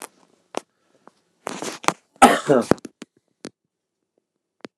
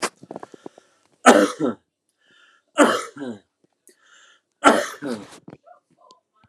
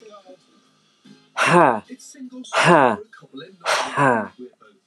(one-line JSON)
{"cough_length": "4.8 s", "cough_amplitude": 29204, "cough_signal_mean_std_ratio": 0.23, "three_cough_length": "6.5 s", "three_cough_amplitude": 29204, "three_cough_signal_mean_std_ratio": 0.3, "exhalation_length": "4.9 s", "exhalation_amplitude": 29203, "exhalation_signal_mean_std_ratio": 0.43, "survey_phase": "beta (2021-08-13 to 2022-03-07)", "age": "45-64", "gender": "Male", "wearing_mask": "No", "symptom_none": true, "smoker_status": "Never smoked", "respiratory_condition_asthma": false, "respiratory_condition_other": false, "recruitment_source": "REACT", "submission_delay": "1 day", "covid_test_result": "Negative", "covid_test_method": "RT-qPCR", "influenza_a_test_result": "Negative", "influenza_b_test_result": "Negative"}